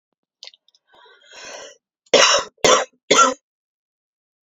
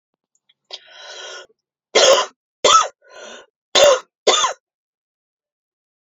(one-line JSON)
{"cough_length": "4.4 s", "cough_amplitude": 29096, "cough_signal_mean_std_ratio": 0.33, "three_cough_length": "6.1 s", "three_cough_amplitude": 29894, "three_cough_signal_mean_std_ratio": 0.34, "survey_phase": "alpha (2021-03-01 to 2021-08-12)", "age": "18-44", "gender": "Female", "wearing_mask": "No", "symptom_cough_any": true, "symptom_abdominal_pain": true, "symptom_diarrhoea": true, "symptom_fatigue": true, "symptom_fever_high_temperature": true, "symptom_headache": true, "symptom_change_to_sense_of_smell_or_taste": true, "symptom_loss_of_taste": true, "symptom_onset": "5 days", "smoker_status": "Current smoker (1 to 10 cigarettes per day)", "respiratory_condition_asthma": false, "respiratory_condition_other": false, "recruitment_source": "Test and Trace", "submission_delay": "2 days", "covid_test_result": "Positive", "covid_test_method": "RT-qPCR", "covid_ct_value": 21.0, "covid_ct_gene": "N gene", "covid_ct_mean": 21.7, "covid_viral_load": "77000 copies/ml", "covid_viral_load_category": "Low viral load (10K-1M copies/ml)"}